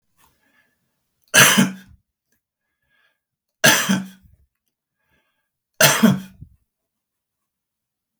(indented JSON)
{
  "three_cough_length": "8.2 s",
  "three_cough_amplitude": 32768,
  "three_cough_signal_mean_std_ratio": 0.28,
  "survey_phase": "beta (2021-08-13 to 2022-03-07)",
  "age": "65+",
  "gender": "Male",
  "wearing_mask": "No",
  "symptom_none": true,
  "smoker_status": "Current smoker (1 to 10 cigarettes per day)",
  "respiratory_condition_asthma": false,
  "respiratory_condition_other": false,
  "recruitment_source": "REACT",
  "submission_delay": "2 days",
  "covid_test_result": "Negative",
  "covid_test_method": "RT-qPCR",
  "influenza_a_test_result": "Negative",
  "influenza_b_test_result": "Negative"
}